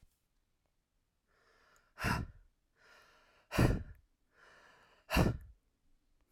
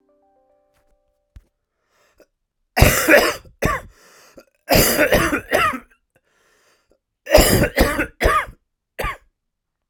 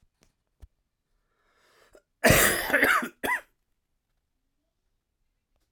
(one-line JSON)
{"exhalation_length": "6.3 s", "exhalation_amplitude": 5252, "exhalation_signal_mean_std_ratio": 0.28, "three_cough_length": "9.9 s", "three_cough_amplitude": 32768, "three_cough_signal_mean_std_ratio": 0.41, "cough_length": "5.7 s", "cough_amplitude": 17761, "cough_signal_mean_std_ratio": 0.31, "survey_phase": "beta (2021-08-13 to 2022-03-07)", "age": "18-44", "gender": "Male", "wearing_mask": "No", "symptom_cough_any": true, "symptom_shortness_of_breath": true, "symptom_fatigue": true, "symptom_fever_high_temperature": true, "symptom_onset": "9 days", "smoker_status": "Never smoked", "respiratory_condition_asthma": false, "respiratory_condition_other": false, "recruitment_source": "Test and Trace", "submission_delay": "1 day", "covid_test_result": "Positive", "covid_test_method": "RT-qPCR", "covid_ct_value": 16.5, "covid_ct_gene": "ORF1ab gene", "covid_ct_mean": 16.9, "covid_viral_load": "2900000 copies/ml", "covid_viral_load_category": "High viral load (>1M copies/ml)"}